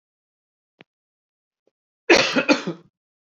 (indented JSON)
{
  "cough_length": "3.2 s",
  "cough_amplitude": 28193,
  "cough_signal_mean_std_ratio": 0.28,
  "survey_phase": "beta (2021-08-13 to 2022-03-07)",
  "age": "18-44",
  "gender": "Male",
  "wearing_mask": "No",
  "symptom_cough_any": true,
  "smoker_status": "Never smoked",
  "respiratory_condition_asthma": false,
  "respiratory_condition_other": false,
  "recruitment_source": "REACT",
  "submission_delay": "1 day",
  "covid_test_result": "Negative",
  "covid_test_method": "RT-qPCR"
}